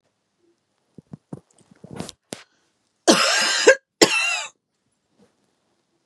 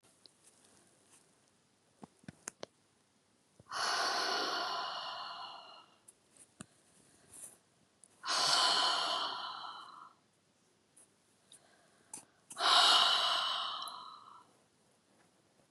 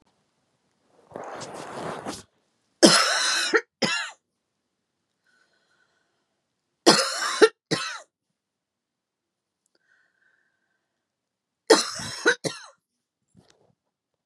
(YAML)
cough_length: 6.1 s
cough_amplitude: 32767
cough_signal_mean_std_ratio: 0.31
exhalation_length: 15.7 s
exhalation_amplitude: 7187
exhalation_signal_mean_std_ratio: 0.43
three_cough_length: 14.3 s
three_cough_amplitude: 31843
three_cough_signal_mean_std_ratio: 0.29
survey_phase: beta (2021-08-13 to 2022-03-07)
age: 45-64
gender: Female
wearing_mask: 'No'
symptom_none: true
smoker_status: Never smoked
respiratory_condition_asthma: false
respiratory_condition_other: false
recruitment_source: REACT
submission_delay: 5 days
covid_test_result: Negative
covid_test_method: RT-qPCR
influenza_a_test_result: Negative
influenza_b_test_result: Negative